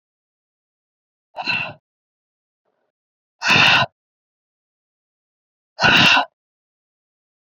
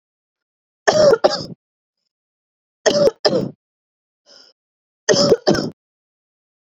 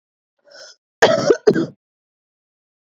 {
  "exhalation_length": "7.4 s",
  "exhalation_amplitude": 28637,
  "exhalation_signal_mean_std_ratio": 0.3,
  "three_cough_length": "6.7 s",
  "three_cough_amplitude": 31772,
  "three_cough_signal_mean_std_ratio": 0.36,
  "cough_length": "3.0 s",
  "cough_amplitude": 28945,
  "cough_signal_mean_std_ratio": 0.31,
  "survey_phase": "beta (2021-08-13 to 2022-03-07)",
  "age": "18-44",
  "gender": "Female",
  "wearing_mask": "No",
  "symptom_sore_throat": true,
  "symptom_fatigue": true,
  "symptom_change_to_sense_of_smell_or_taste": true,
  "symptom_loss_of_taste": true,
  "symptom_onset": "4 days",
  "smoker_status": "Never smoked",
  "respiratory_condition_asthma": true,
  "respiratory_condition_other": false,
  "recruitment_source": "Test and Trace",
  "submission_delay": "2 days",
  "covid_test_result": "Positive",
  "covid_test_method": "RT-qPCR",
  "covid_ct_value": 17.5,
  "covid_ct_gene": "ORF1ab gene",
  "covid_ct_mean": 18.4,
  "covid_viral_load": "940000 copies/ml",
  "covid_viral_load_category": "Low viral load (10K-1M copies/ml)"
}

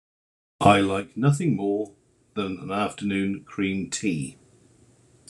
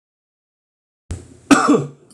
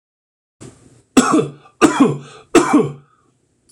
{
  "exhalation_length": "5.3 s",
  "exhalation_amplitude": 25247,
  "exhalation_signal_mean_std_ratio": 0.56,
  "cough_length": "2.1 s",
  "cough_amplitude": 26028,
  "cough_signal_mean_std_ratio": 0.33,
  "three_cough_length": "3.7 s",
  "three_cough_amplitude": 26028,
  "three_cough_signal_mean_std_ratio": 0.41,
  "survey_phase": "beta (2021-08-13 to 2022-03-07)",
  "age": "45-64",
  "gender": "Male",
  "wearing_mask": "No",
  "symptom_none": true,
  "symptom_onset": "12 days",
  "smoker_status": "Ex-smoker",
  "respiratory_condition_asthma": false,
  "respiratory_condition_other": false,
  "recruitment_source": "REACT",
  "submission_delay": "4 days",
  "covid_test_result": "Negative",
  "covid_test_method": "RT-qPCR"
}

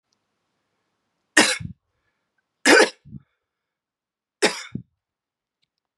{
  "three_cough_length": "6.0 s",
  "three_cough_amplitude": 32010,
  "three_cough_signal_mean_std_ratio": 0.23,
  "survey_phase": "beta (2021-08-13 to 2022-03-07)",
  "age": "18-44",
  "gender": "Female",
  "wearing_mask": "No",
  "symptom_sore_throat": true,
  "symptom_fatigue": true,
  "symptom_headache": true,
  "symptom_other": true,
  "smoker_status": "Never smoked",
  "respiratory_condition_asthma": false,
  "respiratory_condition_other": false,
  "recruitment_source": "Test and Trace",
  "submission_delay": "1 day",
  "covid_test_result": "Positive",
  "covid_test_method": "LFT"
}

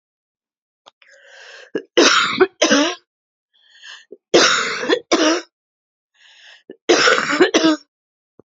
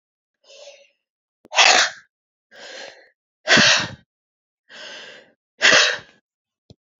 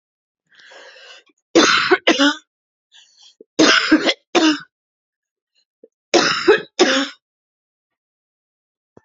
{
  "cough_length": "8.4 s",
  "cough_amplitude": 31422,
  "cough_signal_mean_std_ratio": 0.45,
  "exhalation_length": "7.0 s",
  "exhalation_amplitude": 32418,
  "exhalation_signal_mean_std_ratio": 0.33,
  "three_cough_length": "9.0 s",
  "three_cough_amplitude": 32236,
  "three_cough_signal_mean_std_ratio": 0.39,
  "survey_phase": "beta (2021-08-13 to 2022-03-07)",
  "age": "45-64",
  "gender": "Female",
  "wearing_mask": "No",
  "symptom_cough_any": true,
  "symptom_runny_or_blocked_nose": true,
  "symptom_fatigue": true,
  "symptom_fever_high_temperature": true,
  "symptom_headache": true,
  "symptom_onset": "2 days",
  "smoker_status": "Ex-smoker",
  "respiratory_condition_asthma": false,
  "respiratory_condition_other": false,
  "recruitment_source": "Test and Trace",
  "submission_delay": "1 day",
  "covid_test_result": "Positive",
  "covid_test_method": "RT-qPCR",
  "covid_ct_value": 18.9,
  "covid_ct_gene": "S gene",
  "covid_ct_mean": 19.2,
  "covid_viral_load": "520000 copies/ml",
  "covid_viral_load_category": "Low viral load (10K-1M copies/ml)"
}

